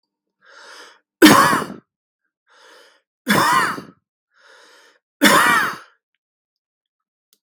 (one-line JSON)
{"three_cough_length": "7.4 s", "three_cough_amplitude": 32768, "three_cough_signal_mean_std_ratio": 0.35, "survey_phase": "beta (2021-08-13 to 2022-03-07)", "age": "45-64", "gender": "Male", "wearing_mask": "No", "symptom_cough_any": true, "symptom_sore_throat": true, "symptom_fatigue": true, "symptom_headache": true, "symptom_change_to_sense_of_smell_or_taste": true, "symptom_loss_of_taste": true, "symptom_onset": "12 days", "smoker_status": "Never smoked", "respiratory_condition_asthma": false, "respiratory_condition_other": false, "recruitment_source": "REACT", "submission_delay": "1 day", "covid_test_result": "Negative", "covid_test_method": "RT-qPCR", "influenza_a_test_result": "Unknown/Void", "influenza_b_test_result": "Unknown/Void"}